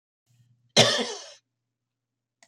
{
  "cough_length": "2.5 s",
  "cough_amplitude": 26504,
  "cough_signal_mean_std_ratio": 0.27,
  "survey_phase": "alpha (2021-03-01 to 2021-08-12)",
  "age": "65+",
  "gender": "Female",
  "wearing_mask": "No",
  "symptom_none": true,
  "smoker_status": "Never smoked",
  "respiratory_condition_asthma": false,
  "respiratory_condition_other": false,
  "recruitment_source": "REACT",
  "submission_delay": "1 day",
  "covid_test_result": "Negative",
  "covid_test_method": "RT-qPCR"
}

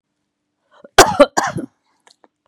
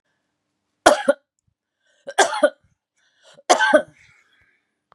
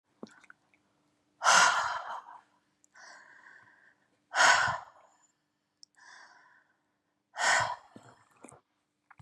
{
  "cough_length": "2.5 s",
  "cough_amplitude": 32768,
  "cough_signal_mean_std_ratio": 0.27,
  "three_cough_length": "4.9 s",
  "three_cough_amplitude": 32767,
  "three_cough_signal_mean_std_ratio": 0.29,
  "exhalation_length": "9.2 s",
  "exhalation_amplitude": 12045,
  "exhalation_signal_mean_std_ratio": 0.31,
  "survey_phase": "beta (2021-08-13 to 2022-03-07)",
  "age": "45-64",
  "gender": "Female",
  "wearing_mask": "No",
  "symptom_none": true,
  "smoker_status": "Ex-smoker",
  "respiratory_condition_asthma": false,
  "respiratory_condition_other": false,
  "recruitment_source": "REACT",
  "submission_delay": "4 days",
  "covid_test_result": "Negative",
  "covid_test_method": "RT-qPCR",
  "influenza_a_test_result": "Negative",
  "influenza_b_test_result": "Negative"
}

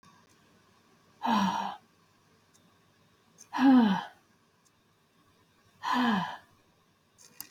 {
  "exhalation_length": "7.5 s",
  "exhalation_amplitude": 7234,
  "exhalation_signal_mean_std_ratio": 0.36,
  "survey_phase": "beta (2021-08-13 to 2022-03-07)",
  "age": "45-64",
  "gender": "Female",
  "wearing_mask": "No",
  "symptom_none": true,
  "smoker_status": "Never smoked",
  "respiratory_condition_asthma": false,
  "respiratory_condition_other": false,
  "recruitment_source": "REACT",
  "submission_delay": "2 days",
  "covid_test_result": "Negative",
  "covid_test_method": "RT-qPCR"
}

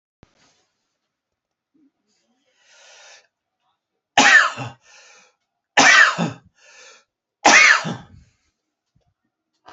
{
  "three_cough_length": "9.7 s",
  "three_cough_amplitude": 31498,
  "three_cough_signal_mean_std_ratio": 0.29,
  "survey_phase": "alpha (2021-03-01 to 2021-08-12)",
  "age": "45-64",
  "gender": "Male",
  "wearing_mask": "No",
  "symptom_none": true,
  "smoker_status": "Never smoked",
  "respiratory_condition_asthma": false,
  "respiratory_condition_other": false,
  "recruitment_source": "REACT",
  "submission_delay": "2 days",
  "covid_test_result": "Negative",
  "covid_test_method": "RT-qPCR"
}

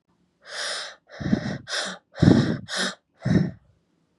{
  "exhalation_length": "4.2 s",
  "exhalation_amplitude": 27278,
  "exhalation_signal_mean_std_ratio": 0.45,
  "survey_phase": "beta (2021-08-13 to 2022-03-07)",
  "age": "18-44",
  "gender": "Female",
  "wearing_mask": "No",
  "symptom_cough_any": true,
  "symptom_runny_or_blocked_nose": true,
  "symptom_headache": true,
  "smoker_status": "Never smoked",
  "respiratory_condition_asthma": false,
  "respiratory_condition_other": false,
  "recruitment_source": "Test and Trace",
  "submission_delay": "2 days",
  "covid_test_result": "Positive",
  "covid_test_method": "RT-qPCR",
  "covid_ct_value": 16.0,
  "covid_ct_gene": "ORF1ab gene",
  "covid_ct_mean": 16.3,
  "covid_viral_load": "4500000 copies/ml",
  "covid_viral_load_category": "High viral load (>1M copies/ml)"
}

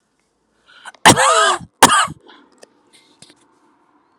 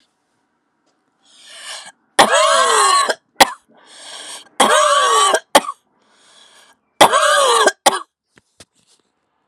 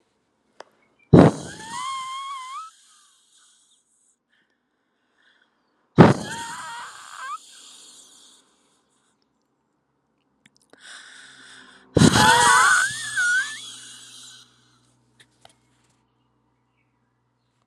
{
  "cough_length": "4.2 s",
  "cough_amplitude": 32768,
  "cough_signal_mean_std_ratio": 0.33,
  "three_cough_length": "9.5 s",
  "three_cough_amplitude": 32768,
  "three_cough_signal_mean_std_ratio": 0.45,
  "exhalation_length": "17.7 s",
  "exhalation_amplitude": 32768,
  "exhalation_signal_mean_std_ratio": 0.28,
  "survey_phase": "alpha (2021-03-01 to 2021-08-12)",
  "age": "45-64",
  "gender": "Female",
  "wearing_mask": "No",
  "symptom_none": true,
  "symptom_onset": "3 days",
  "smoker_status": "Current smoker (e-cigarettes or vapes only)",
  "respiratory_condition_asthma": false,
  "respiratory_condition_other": false,
  "recruitment_source": "Test and Trace",
  "submission_delay": "2 days",
  "covid_test_result": "Positive",
  "covid_test_method": "RT-qPCR"
}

